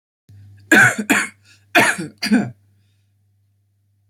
{"cough_length": "4.1 s", "cough_amplitude": 27245, "cough_signal_mean_std_ratio": 0.39, "survey_phase": "beta (2021-08-13 to 2022-03-07)", "age": "18-44", "gender": "Female", "wearing_mask": "Yes", "symptom_cough_any": true, "symptom_runny_or_blocked_nose": true, "symptom_onset": "8 days", "smoker_status": "Never smoked", "respiratory_condition_asthma": false, "respiratory_condition_other": false, "recruitment_source": "REACT", "submission_delay": "1 day", "covid_test_result": "Negative", "covid_test_method": "RT-qPCR"}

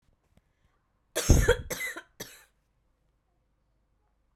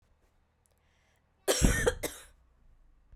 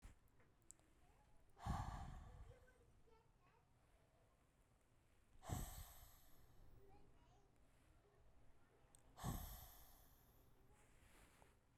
{"three_cough_length": "4.4 s", "three_cough_amplitude": 17116, "three_cough_signal_mean_std_ratio": 0.25, "cough_length": "3.2 s", "cough_amplitude": 10496, "cough_signal_mean_std_ratio": 0.33, "exhalation_length": "11.8 s", "exhalation_amplitude": 737, "exhalation_signal_mean_std_ratio": 0.48, "survey_phase": "beta (2021-08-13 to 2022-03-07)", "age": "18-44", "gender": "Female", "wearing_mask": "No", "symptom_cough_any": true, "symptom_runny_or_blocked_nose": true, "symptom_sore_throat": true, "symptom_fatigue": true, "symptom_fever_high_temperature": true, "symptom_headache": true, "symptom_change_to_sense_of_smell_or_taste": true, "symptom_other": true, "symptom_onset": "3 days", "smoker_status": "Never smoked", "respiratory_condition_asthma": false, "respiratory_condition_other": false, "recruitment_source": "Test and Trace", "submission_delay": "2 days", "covid_test_result": "Positive", "covid_test_method": "RT-qPCR", "covid_ct_value": 24.5, "covid_ct_gene": "ORF1ab gene"}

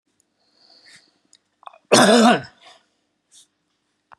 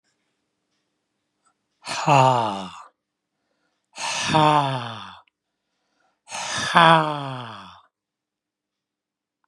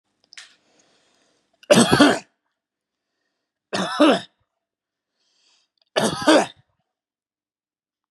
{"cough_length": "4.2 s", "cough_amplitude": 31578, "cough_signal_mean_std_ratio": 0.28, "exhalation_length": "9.5 s", "exhalation_amplitude": 32469, "exhalation_signal_mean_std_ratio": 0.36, "three_cough_length": "8.1 s", "three_cough_amplitude": 31712, "three_cough_signal_mean_std_ratio": 0.29, "survey_phase": "beta (2021-08-13 to 2022-03-07)", "age": "65+", "gender": "Male", "wearing_mask": "No", "symptom_cough_any": true, "symptom_sore_throat": true, "symptom_onset": "8 days", "smoker_status": "Never smoked", "respiratory_condition_asthma": false, "respiratory_condition_other": false, "recruitment_source": "REACT", "submission_delay": "1 day", "covid_test_result": "Negative", "covid_test_method": "RT-qPCR", "influenza_a_test_result": "Negative", "influenza_b_test_result": "Negative"}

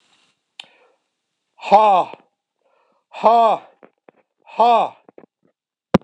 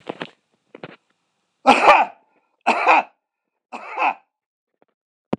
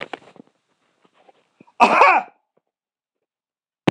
{"exhalation_length": "6.0 s", "exhalation_amplitude": 26028, "exhalation_signal_mean_std_ratio": 0.34, "three_cough_length": "5.4 s", "three_cough_amplitude": 26028, "three_cough_signal_mean_std_ratio": 0.33, "cough_length": "3.9 s", "cough_amplitude": 26028, "cough_signal_mean_std_ratio": 0.27, "survey_phase": "alpha (2021-03-01 to 2021-08-12)", "age": "65+", "gender": "Male", "wearing_mask": "Yes", "symptom_none": true, "smoker_status": "Ex-smoker", "respiratory_condition_asthma": false, "respiratory_condition_other": false, "recruitment_source": "Test and Trace", "submission_delay": "2 days", "covid_test_result": "Positive", "covid_test_method": "RT-qPCR", "covid_ct_value": 23.7, "covid_ct_gene": "ORF1ab gene", "covid_ct_mean": 24.7, "covid_viral_load": "7800 copies/ml", "covid_viral_load_category": "Minimal viral load (< 10K copies/ml)"}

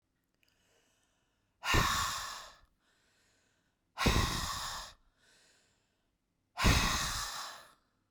{"exhalation_length": "8.1 s", "exhalation_amplitude": 6509, "exhalation_signal_mean_std_ratio": 0.41, "survey_phase": "beta (2021-08-13 to 2022-03-07)", "age": "45-64", "gender": "Female", "wearing_mask": "No", "symptom_none": true, "symptom_onset": "7 days", "smoker_status": "Ex-smoker", "respiratory_condition_asthma": false, "respiratory_condition_other": false, "recruitment_source": "REACT", "submission_delay": "1 day", "covid_test_result": "Negative", "covid_test_method": "RT-qPCR", "influenza_a_test_result": "Unknown/Void", "influenza_b_test_result": "Unknown/Void"}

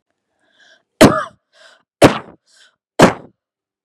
{"three_cough_length": "3.8 s", "three_cough_amplitude": 32768, "three_cough_signal_mean_std_ratio": 0.26, "survey_phase": "beta (2021-08-13 to 2022-03-07)", "age": "45-64", "gender": "Female", "wearing_mask": "No", "symptom_none": true, "smoker_status": "Never smoked", "respiratory_condition_asthma": false, "respiratory_condition_other": false, "recruitment_source": "REACT", "submission_delay": "1 day", "covid_test_result": "Negative", "covid_test_method": "RT-qPCR", "influenza_a_test_result": "Negative", "influenza_b_test_result": "Negative"}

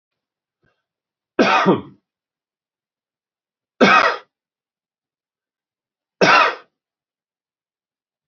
{"three_cough_length": "8.3 s", "three_cough_amplitude": 28437, "three_cough_signal_mean_std_ratio": 0.28, "survey_phase": "beta (2021-08-13 to 2022-03-07)", "age": "45-64", "gender": "Male", "wearing_mask": "No", "symptom_none": true, "smoker_status": "Ex-smoker", "respiratory_condition_asthma": false, "respiratory_condition_other": false, "recruitment_source": "REACT", "submission_delay": "2 days", "covid_test_result": "Negative", "covid_test_method": "RT-qPCR", "influenza_a_test_result": "Negative", "influenza_b_test_result": "Negative"}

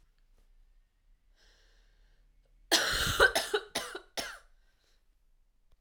{"cough_length": "5.8 s", "cough_amplitude": 10306, "cough_signal_mean_std_ratio": 0.33, "survey_phase": "alpha (2021-03-01 to 2021-08-12)", "age": "18-44", "gender": "Female", "wearing_mask": "No", "symptom_cough_any": true, "symptom_fatigue": true, "symptom_headache": true, "symptom_onset": "3 days", "smoker_status": "Never smoked", "respiratory_condition_asthma": false, "respiratory_condition_other": false, "recruitment_source": "Test and Trace", "submission_delay": "1 day", "covid_test_result": "Positive", "covid_test_method": "RT-qPCR", "covid_ct_value": 21.2, "covid_ct_gene": "ORF1ab gene", "covid_ct_mean": 22.1, "covid_viral_load": "55000 copies/ml", "covid_viral_load_category": "Low viral load (10K-1M copies/ml)"}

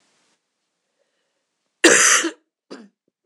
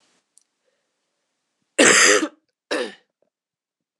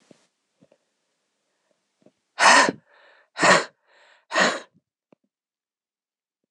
{"three_cough_length": "3.3 s", "three_cough_amplitude": 26028, "three_cough_signal_mean_std_ratio": 0.3, "cough_length": "4.0 s", "cough_amplitude": 26028, "cough_signal_mean_std_ratio": 0.3, "exhalation_length": "6.5 s", "exhalation_amplitude": 25826, "exhalation_signal_mean_std_ratio": 0.27, "survey_phase": "beta (2021-08-13 to 2022-03-07)", "age": "18-44", "gender": "Female", "wearing_mask": "No", "symptom_cough_any": true, "symptom_runny_or_blocked_nose": true, "symptom_sore_throat": true, "symptom_fatigue": true, "symptom_fever_high_temperature": true, "symptom_change_to_sense_of_smell_or_taste": true, "symptom_onset": "2 days", "smoker_status": "Never smoked", "respiratory_condition_asthma": false, "respiratory_condition_other": false, "recruitment_source": "Test and Trace", "submission_delay": "2 days", "covid_test_result": "Positive", "covid_test_method": "RT-qPCR"}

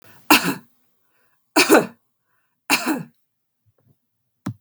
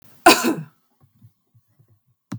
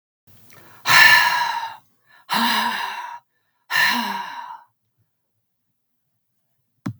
{"three_cough_length": "4.6 s", "three_cough_amplitude": 32768, "three_cough_signal_mean_std_ratio": 0.3, "cough_length": "2.4 s", "cough_amplitude": 32768, "cough_signal_mean_std_ratio": 0.26, "exhalation_length": "7.0 s", "exhalation_amplitude": 32767, "exhalation_signal_mean_std_ratio": 0.41, "survey_phase": "beta (2021-08-13 to 2022-03-07)", "age": "45-64", "gender": "Female", "wearing_mask": "No", "symptom_none": true, "smoker_status": "Never smoked", "respiratory_condition_asthma": false, "respiratory_condition_other": false, "recruitment_source": "REACT", "submission_delay": "2 days", "covid_test_result": "Negative", "covid_test_method": "RT-qPCR", "influenza_a_test_result": "Negative", "influenza_b_test_result": "Negative"}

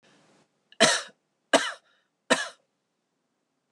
{"three_cough_length": "3.7 s", "three_cough_amplitude": 23376, "three_cough_signal_mean_std_ratio": 0.26, "survey_phase": "alpha (2021-03-01 to 2021-08-12)", "age": "45-64", "gender": "Female", "wearing_mask": "No", "symptom_none": true, "smoker_status": "Never smoked", "respiratory_condition_asthma": false, "respiratory_condition_other": false, "recruitment_source": "REACT", "submission_delay": "2 days", "covid_test_result": "Negative", "covid_test_method": "RT-qPCR"}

